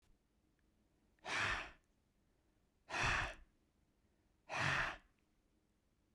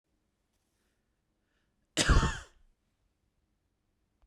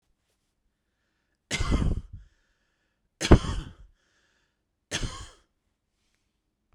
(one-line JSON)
{"exhalation_length": "6.1 s", "exhalation_amplitude": 2039, "exhalation_signal_mean_std_ratio": 0.39, "cough_length": "4.3 s", "cough_amplitude": 10611, "cough_signal_mean_std_ratio": 0.22, "three_cough_length": "6.7 s", "three_cough_amplitude": 32768, "three_cough_signal_mean_std_ratio": 0.24, "survey_phase": "beta (2021-08-13 to 2022-03-07)", "age": "18-44", "gender": "Male", "wearing_mask": "No", "symptom_none": true, "smoker_status": "Never smoked", "respiratory_condition_asthma": false, "respiratory_condition_other": false, "recruitment_source": "REACT", "submission_delay": "2 days", "covid_test_result": "Negative", "covid_test_method": "RT-qPCR", "influenza_a_test_result": "Negative", "influenza_b_test_result": "Negative"}